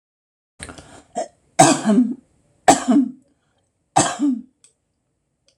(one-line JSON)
{"three_cough_length": "5.6 s", "three_cough_amplitude": 26028, "three_cough_signal_mean_std_ratio": 0.38, "survey_phase": "alpha (2021-03-01 to 2021-08-12)", "age": "65+", "gender": "Female", "wearing_mask": "No", "symptom_none": true, "smoker_status": "Ex-smoker", "respiratory_condition_asthma": false, "respiratory_condition_other": false, "recruitment_source": "REACT", "submission_delay": "2 days", "covid_test_result": "Negative", "covid_test_method": "RT-qPCR"}